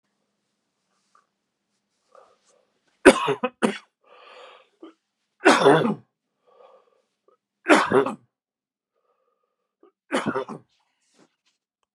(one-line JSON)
{"three_cough_length": "11.9 s", "three_cough_amplitude": 32768, "three_cough_signal_mean_std_ratio": 0.25, "survey_phase": "beta (2021-08-13 to 2022-03-07)", "age": "65+", "gender": "Male", "wearing_mask": "No", "symptom_cough_any": true, "smoker_status": "Never smoked", "respiratory_condition_asthma": false, "respiratory_condition_other": false, "recruitment_source": "REACT", "submission_delay": "2 days", "covid_test_result": "Negative", "covid_test_method": "RT-qPCR"}